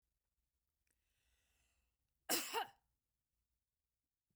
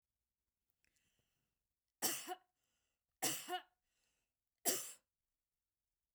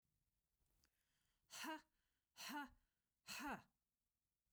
{
  "cough_length": "4.4 s",
  "cough_amplitude": 2336,
  "cough_signal_mean_std_ratio": 0.22,
  "three_cough_length": "6.1 s",
  "three_cough_amplitude": 2996,
  "three_cough_signal_mean_std_ratio": 0.28,
  "exhalation_length": "4.5 s",
  "exhalation_amplitude": 358,
  "exhalation_signal_mean_std_ratio": 0.38,
  "survey_phase": "beta (2021-08-13 to 2022-03-07)",
  "age": "45-64",
  "gender": "Female",
  "wearing_mask": "No",
  "symptom_none": true,
  "smoker_status": "Never smoked",
  "respiratory_condition_asthma": false,
  "respiratory_condition_other": false,
  "recruitment_source": "REACT",
  "submission_delay": "2 days",
  "covid_test_result": "Negative",
  "covid_test_method": "RT-qPCR",
  "influenza_a_test_result": "Negative",
  "influenza_b_test_result": "Negative"
}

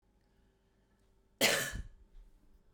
{
  "cough_length": "2.7 s",
  "cough_amplitude": 5713,
  "cough_signal_mean_std_ratio": 0.31,
  "survey_phase": "beta (2021-08-13 to 2022-03-07)",
  "age": "18-44",
  "gender": "Female",
  "wearing_mask": "No",
  "symptom_cough_any": true,
  "symptom_sore_throat": true,
  "symptom_onset": "12 days",
  "smoker_status": "Never smoked",
  "respiratory_condition_asthma": false,
  "respiratory_condition_other": false,
  "recruitment_source": "REACT",
  "submission_delay": "1 day",
  "covid_test_result": "Negative",
  "covid_test_method": "RT-qPCR"
}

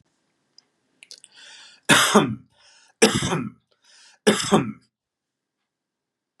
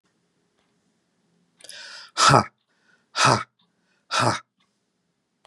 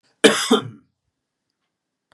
{
  "three_cough_length": "6.4 s",
  "three_cough_amplitude": 31808,
  "three_cough_signal_mean_std_ratio": 0.32,
  "exhalation_length": "5.5 s",
  "exhalation_amplitude": 31820,
  "exhalation_signal_mean_std_ratio": 0.29,
  "cough_length": "2.1 s",
  "cough_amplitude": 32767,
  "cough_signal_mean_std_ratio": 0.28,
  "survey_phase": "beta (2021-08-13 to 2022-03-07)",
  "age": "45-64",
  "gender": "Male",
  "wearing_mask": "No",
  "symptom_none": true,
  "smoker_status": "Never smoked",
  "respiratory_condition_asthma": false,
  "respiratory_condition_other": false,
  "recruitment_source": "REACT",
  "submission_delay": "2 days",
  "covid_test_result": "Negative",
  "covid_test_method": "RT-qPCR",
  "influenza_a_test_result": "Negative",
  "influenza_b_test_result": "Negative"
}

